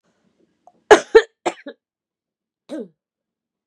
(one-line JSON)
{"cough_length": "3.7 s", "cough_amplitude": 32768, "cough_signal_mean_std_ratio": 0.19, "survey_phase": "beta (2021-08-13 to 2022-03-07)", "age": "45-64", "gender": "Female", "wearing_mask": "No", "symptom_cough_any": true, "symptom_runny_or_blocked_nose": true, "symptom_sore_throat": true, "symptom_fatigue": true, "symptom_headache": true, "symptom_change_to_sense_of_smell_or_taste": true, "symptom_loss_of_taste": true, "symptom_other": true, "smoker_status": "Ex-smoker", "respiratory_condition_asthma": false, "respiratory_condition_other": true, "recruitment_source": "Test and Trace", "submission_delay": "5 days", "covid_test_result": "Positive", "covid_test_method": "RT-qPCR", "covid_ct_value": 28.5, "covid_ct_gene": "ORF1ab gene", "covid_ct_mean": 28.8, "covid_viral_load": "360 copies/ml", "covid_viral_load_category": "Minimal viral load (< 10K copies/ml)"}